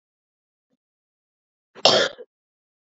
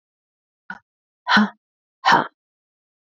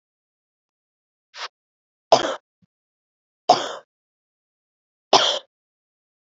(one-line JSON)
{"cough_length": "3.0 s", "cough_amplitude": 30603, "cough_signal_mean_std_ratio": 0.22, "exhalation_length": "3.1 s", "exhalation_amplitude": 25338, "exhalation_signal_mean_std_ratio": 0.29, "three_cough_length": "6.2 s", "three_cough_amplitude": 30190, "three_cough_signal_mean_std_ratio": 0.22, "survey_phase": "beta (2021-08-13 to 2022-03-07)", "age": "18-44", "gender": "Female", "wearing_mask": "No", "symptom_cough_any": true, "symptom_new_continuous_cough": true, "symptom_runny_or_blocked_nose": true, "smoker_status": "Ex-smoker", "respiratory_condition_asthma": false, "respiratory_condition_other": false, "recruitment_source": "Test and Trace", "submission_delay": "2 days", "covid_test_result": "Positive", "covid_test_method": "LFT"}